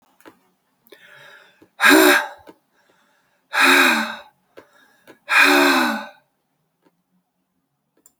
exhalation_length: 8.2 s
exhalation_amplitude: 32766
exhalation_signal_mean_std_ratio: 0.38
survey_phase: beta (2021-08-13 to 2022-03-07)
age: 65+
gender: Female
wearing_mask: 'No'
symptom_none: true
smoker_status: Ex-smoker
respiratory_condition_asthma: false
respiratory_condition_other: false
recruitment_source: REACT
submission_delay: 2 days
covid_test_result: Negative
covid_test_method: RT-qPCR
influenza_a_test_result: Negative
influenza_b_test_result: Negative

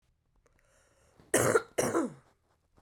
cough_length: 2.8 s
cough_amplitude: 8571
cough_signal_mean_std_ratio: 0.36
survey_phase: beta (2021-08-13 to 2022-03-07)
age: 45-64
gender: Female
wearing_mask: 'No'
symptom_cough_any: true
symptom_runny_or_blocked_nose: true
symptom_sore_throat: true
symptom_fatigue: true
symptom_fever_high_temperature: true
symptom_headache: true
symptom_other: true
symptom_onset: 3 days
smoker_status: Never smoked
respiratory_condition_asthma: false
respiratory_condition_other: false
recruitment_source: Test and Trace
submission_delay: 2 days
covid_test_result: Positive
covid_test_method: ePCR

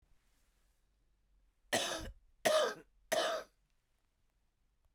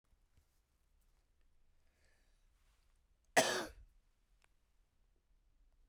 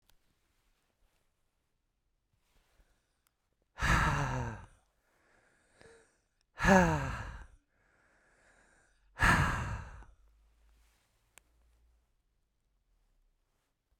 three_cough_length: 4.9 s
three_cough_amplitude: 4937
three_cough_signal_mean_std_ratio: 0.35
cough_length: 5.9 s
cough_amplitude: 5268
cough_signal_mean_std_ratio: 0.19
exhalation_length: 14.0 s
exhalation_amplitude: 10500
exhalation_signal_mean_std_ratio: 0.29
survey_phase: beta (2021-08-13 to 2022-03-07)
age: 45-64
gender: Female
wearing_mask: 'No'
symptom_cough_any: true
symptom_runny_or_blocked_nose: true
symptom_shortness_of_breath: true
symptom_sore_throat: true
symptom_headache: true
smoker_status: Ex-smoker
respiratory_condition_asthma: false
respiratory_condition_other: true
recruitment_source: Test and Trace
submission_delay: 2 days
covid_test_result: Positive
covid_test_method: RT-qPCR
covid_ct_value: 17.1
covid_ct_gene: ORF1ab gene
covid_ct_mean: 17.7
covid_viral_load: 1600000 copies/ml
covid_viral_load_category: High viral load (>1M copies/ml)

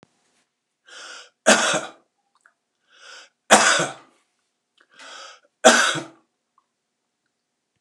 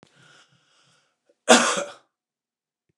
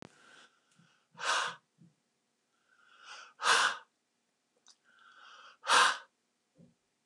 three_cough_length: 7.8 s
three_cough_amplitude: 29204
three_cough_signal_mean_std_ratio: 0.29
cough_length: 3.0 s
cough_amplitude: 29203
cough_signal_mean_std_ratio: 0.24
exhalation_length: 7.1 s
exhalation_amplitude: 8457
exhalation_signal_mean_std_ratio: 0.3
survey_phase: beta (2021-08-13 to 2022-03-07)
age: 65+
gender: Male
wearing_mask: 'No'
symptom_none: true
smoker_status: Ex-smoker
respiratory_condition_asthma: false
respiratory_condition_other: false
recruitment_source: REACT
submission_delay: 3 days
covid_test_result: Negative
covid_test_method: RT-qPCR
influenza_a_test_result: Unknown/Void
influenza_b_test_result: Unknown/Void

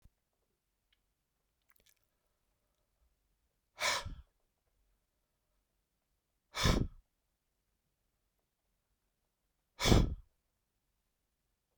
exhalation_length: 11.8 s
exhalation_amplitude: 9899
exhalation_signal_mean_std_ratio: 0.2
survey_phase: beta (2021-08-13 to 2022-03-07)
age: 45-64
gender: Male
wearing_mask: 'No'
symptom_none: true
smoker_status: Never smoked
respiratory_condition_asthma: false
respiratory_condition_other: false
recruitment_source: REACT
submission_delay: 2 days
covid_test_result: Negative
covid_test_method: RT-qPCR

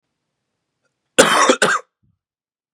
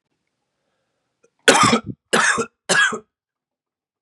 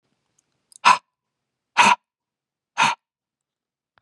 cough_length: 2.7 s
cough_amplitude: 32768
cough_signal_mean_std_ratio: 0.35
three_cough_length: 4.0 s
three_cough_amplitude: 32768
three_cough_signal_mean_std_ratio: 0.38
exhalation_length: 4.0 s
exhalation_amplitude: 29012
exhalation_signal_mean_std_ratio: 0.25
survey_phase: beta (2021-08-13 to 2022-03-07)
age: 18-44
gender: Male
wearing_mask: 'No'
symptom_cough_any: true
symptom_runny_or_blocked_nose: true
symptom_sore_throat: true
symptom_fatigue: true
symptom_fever_high_temperature: true
symptom_change_to_sense_of_smell_or_taste: true
symptom_onset: 7 days
smoker_status: Never smoked
respiratory_condition_asthma: false
respiratory_condition_other: false
recruitment_source: Test and Trace
submission_delay: 3 days
covid_test_result: Positive
covid_test_method: RT-qPCR
covid_ct_value: 16.9
covid_ct_gene: ORF1ab gene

